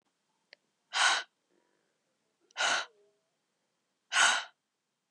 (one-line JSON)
{"exhalation_length": "5.1 s", "exhalation_amplitude": 9154, "exhalation_signal_mean_std_ratio": 0.32, "survey_phase": "beta (2021-08-13 to 2022-03-07)", "age": "18-44", "gender": "Female", "wearing_mask": "No", "symptom_cough_any": true, "symptom_runny_or_blocked_nose": true, "symptom_sore_throat": true, "symptom_fatigue": true, "symptom_fever_high_temperature": true, "symptom_headache": true, "symptom_change_to_sense_of_smell_or_taste": true, "symptom_onset": "2 days", "smoker_status": "Never smoked", "respiratory_condition_asthma": false, "respiratory_condition_other": false, "recruitment_source": "Test and Trace", "submission_delay": "2 days", "covid_test_result": "Positive", "covid_test_method": "RT-qPCR", "covid_ct_value": 14.8, "covid_ct_gene": "ORF1ab gene", "covid_ct_mean": 15.0, "covid_viral_load": "12000000 copies/ml", "covid_viral_load_category": "High viral load (>1M copies/ml)"}